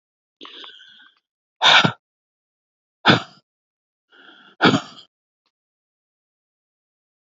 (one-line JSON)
{"exhalation_length": "7.3 s", "exhalation_amplitude": 30242, "exhalation_signal_mean_std_ratio": 0.23, "survey_phase": "alpha (2021-03-01 to 2021-08-12)", "age": "18-44", "gender": "Female", "wearing_mask": "No", "symptom_none": true, "smoker_status": "Ex-smoker", "respiratory_condition_asthma": false, "respiratory_condition_other": false, "recruitment_source": "REACT", "submission_delay": "1 day", "covid_test_result": "Negative", "covid_test_method": "RT-qPCR"}